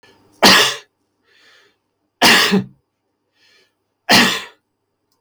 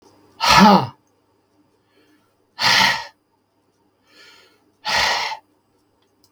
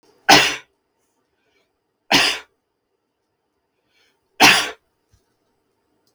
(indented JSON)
{
  "cough_length": "5.2 s",
  "cough_amplitude": 32768,
  "cough_signal_mean_std_ratio": 0.37,
  "exhalation_length": "6.3 s",
  "exhalation_amplitude": 32768,
  "exhalation_signal_mean_std_ratio": 0.35,
  "three_cough_length": "6.1 s",
  "three_cough_amplitude": 32768,
  "three_cough_signal_mean_std_ratio": 0.26,
  "survey_phase": "beta (2021-08-13 to 2022-03-07)",
  "age": "65+",
  "gender": "Male",
  "wearing_mask": "No",
  "symptom_none": true,
  "smoker_status": "Never smoked",
  "respiratory_condition_asthma": false,
  "respiratory_condition_other": false,
  "recruitment_source": "REACT",
  "submission_delay": "3 days",
  "covid_test_result": "Negative",
  "covid_test_method": "RT-qPCR",
  "influenza_a_test_result": "Negative",
  "influenza_b_test_result": "Negative"
}